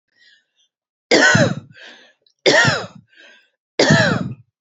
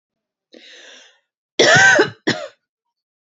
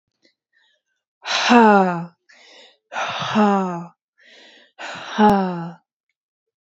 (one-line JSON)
{"three_cough_length": "4.6 s", "three_cough_amplitude": 31102, "three_cough_signal_mean_std_ratio": 0.44, "cough_length": "3.3 s", "cough_amplitude": 32767, "cough_signal_mean_std_ratio": 0.36, "exhalation_length": "6.7 s", "exhalation_amplitude": 28073, "exhalation_signal_mean_std_ratio": 0.44, "survey_phase": "beta (2021-08-13 to 2022-03-07)", "age": "18-44", "gender": "Female", "wearing_mask": "No", "symptom_none": true, "smoker_status": "Ex-smoker", "respiratory_condition_asthma": false, "respiratory_condition_other": false, "recruitment_source": "REACT", "submission_delay": "1 day", "covid_test_result": "Negative", "covid_test_method": "RT-qPCR"}